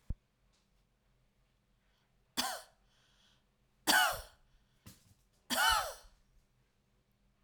{"cough_length": "7.4 s", "cough_amplitude": 5831, "cough_signal_mean_std_ratio": 0.29, "survey_phase": "alpha (2021-03-01 to 2021-08-12)", "age": "65+", "gender": "Female", "wearing_mask": "No", "symptom_none": true, "smoker_status": "Never smoked", "respiratory_condition_asthma": false, "respiratory_condition_other": false, "recruitment_source": "REACT", "submission_delay": "4 days", "covid_test_result": "Negative", "covid_test_method": "RT-qPCR", "covid_ct_value": 45.0, "covid_ct_gene": "N gene"}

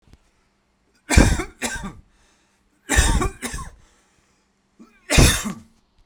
{"three_cough_length": "6.1 s", "three_cough_amplitude": 32767, "three_cough_signal_mean_std_ratio": 0.36, "survey_phase": "beta (2021-08-13 to 2022-03-07)", "age": "18-44", "gender": "Male", "wearing_mask": "No", "symptom_none": true, "smoker_status": "Current smoker (e-cigarettes or vapes only)", "respiratory_condition_asthma": false, "respiratory_condition_other": false, "recruitment_source": "REACT", "submission_delay": "2 days", "covid_test_result": "Negative", "covid_test_method": "RT-qPCR", "influenza_a_test_result": "Negative", "influenza_b_test_result": "Negative"}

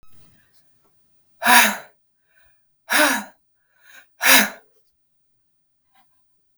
{"exhalation_length": "6.6 s", "exhalation_amplitude": 32768, "exhalation_signal_mean_std_ratio": 0.29, "survey_phase": "beta (2021-08-13 to 2022-03-07)", "age": "45-64", "gender": "Female", "wearing_mask": "No", "symptom_cough_any": true, "symptom_fatigue": true, "symptom_headache": true, "symptom_other": true, "symptom_onset": "6 days", "smoker_status": "Never smoked", "respiratory_condition_asthma": false, "respiratory_condition_other": false, "recruitment_source": "REACT", "submission_delay": "1 day", "covid_test_result": "Negative", "covid_test_method": "RT-qPCR", "influenza_a_test_result": "Negative", "influenza_b_test_result": "Negative"}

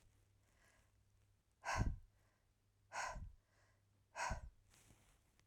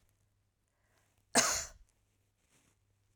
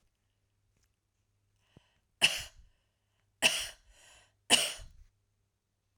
{"exhalation_length": "5.5 s", "exhalation_amplitude": 1655, "exhalation_signal_mean_std_ratio": 0.35, "cough_length": "3.2 s", "cough_amplitude": 7386, "cough_signal_mean_std_ratio": 0.23, "three_cough_length": "6.0 s", "three_cough_amplitude": 13122, "three_cough_signal_mean_std_ratio": 0.23, "survey_phase": "alpha (2021-03-01 to 2021-08-12)", "age": "65+", "gender": "Female", "wearing_mask": "No", "symptom_none": true, "smoker_status": "Ex-smoker", "respiratory_condition_asthma": false, "respiratory_condition_other": false, "recruitment_source": "REACT", "submission_delay": "3 days", "covid_test_result": "Negative", "covid_test_method": "RT-qPCR"}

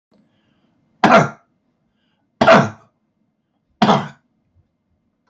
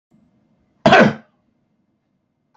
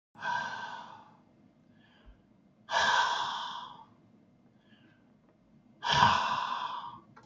{"three_cough_length": "5.3 s", "three_cough_amplitude": 30990, "three_cough_signal_mean_std_ratio": 0.3, "cough_length": "2.6 s", "cough_amplitude": 29060, "cough_signal_mean_std_ratio": 0.27, "exhalation_length": "7.3 s", "exhalation_amplitude": 12555, "exhalation_signal_mean_std_ratio": 0.46, "survey_phase": "beta (2021-08-13 to 2022-03-07)", "age": "65+", "gender": "Male", "wearing_mask": "No", "symptom_none": true, "symptom_onset": "12 days", "smoker_status": "Never smoked", "respiratory_condition_asthma": false, "respiratory_condition_other": false, "recruitment_source": "REACT", "submission_delay": "1 day", "covid_test_result": "Negative", "covid_test_method": "RT-qPCR", "influenza_a_test_result": "Negative", "influenza_b_test_result": "Negative"}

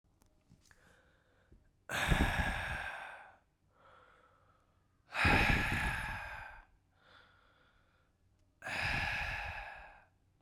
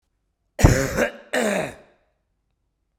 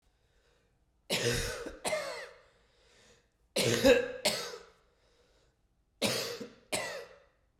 {"exhalation_length": "10.4 s", "exhalation_amplitude": 5726, "exhalation_signal_mean_std_ratio": 0.46, "cough_length": "3.0 s", "cough_amplitude": 32767, "cough_signal_mean_std_ratio": 0.37, "three_cough_length": "7.6 s", "three_cough_amplitude": 9353, "three_cough_signal_mean_std_ratio": 0.41, "survey_phase": "beta (2021-08-13 to 2022-03-07)", "age": "18-44", "gender": "Male", "wearing_mask": "No", "symptom_cough_any": true, "symptom_runny_or_blocked_nose": true, "symptom_sore_throat": true, "symptom_fatigue": true, "symptom_headache": true, "symptom_onset": "7 days", "smoker_status": "Never smoked", "respiratory_condition_asthma": false, "respiratory_condition_other": false, "recruitment_source": "Test and Trace", "submission_delay": "1 day", "covid_test_result": "Positive", "covid_test_method": "ePCR"}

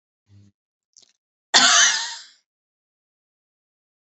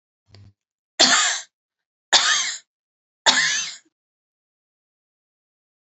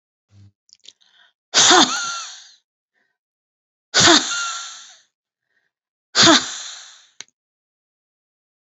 {"cough_length": "4.1 s", "cough_amplitude": 31284, "cough_signal_mean_std_ratio": 0.28, "three_cough_length": "5.8 s", "three_cough_amplitude": 32644, "three_cough_signal_mean_std_ratio": 0.35, "exhalation_length": "8.7 s", "exhalation_amplitude": 30835, "exhalation_signal_mean_std_ratio": 0.32, "survey_phase": "beta (2021-08-13 to 2022-03-07)", "age": "65+", "gender": "Female", "wearing_mask": "No", "symptom_none": true, "smoker_status": "Never smoked", "respiratory_condition_asthma": false, "respiratory_condition_other": true, "recruitment_source": "REACT", "submission_delay": "3 days", "covid_test_result": "Negative", "covid_test_method": "RT-qPCR", "influenza_a_test_result": "Negative", "influenza_b_test_result": "Negative"}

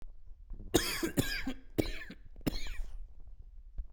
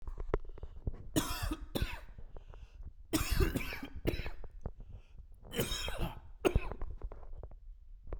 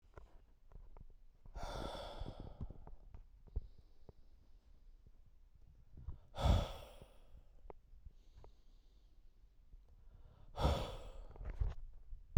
{"cough_length": "3.9 s", "cough_amplitude": 7994, "cough_signal_mean_std_ratio": 0.69, "three_cough_length": "8.2 s", "three_cough_amplitude": 7063, "three_cough_signal_mean_std_ratio": 0.67, "exhalation_length": "12.4 s", "exhalation_amplitude": 4926, "exhalation_signal_mean_std_ratio": 0.42, "survey_phase": "beta (2021-08-13 to 2022-03-07)", "age": "45-64", "gender": "Male", "wearing_mask": "No", "symptom_none": true, "smoker_status": "Never smoked", "respiratory_condition_asthma": false, "respiratory_condition_other": false, "recruitment_source": "REACT", "submission_delay": "1 day", "covid_test_result": "Negative", "covid_test_method": "RT-qPCR"}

